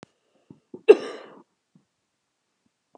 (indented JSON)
{
  "cough_length": "3.0 s",
  "cough_amplitude": 32049,
  "cough_signal_mean_std_ratio": 0.14,
  "survey_phase": "beta (2021-08-13 to 2022-03-07)",
  "age": "65+",
  "gender": "Female",
  "wearing_mask": "No",
  "symptom_none": true,
  "smoker_status": "Never smoked",
  "respiratory_condition_asthma": true,
  "respiratory_condition_other": false,
  "recruitment_source": "REACT",
  "submission_delay": "2 days",
  "covid_test_result": "Negative",
  "covid_test_method": "RT-qPCR"
}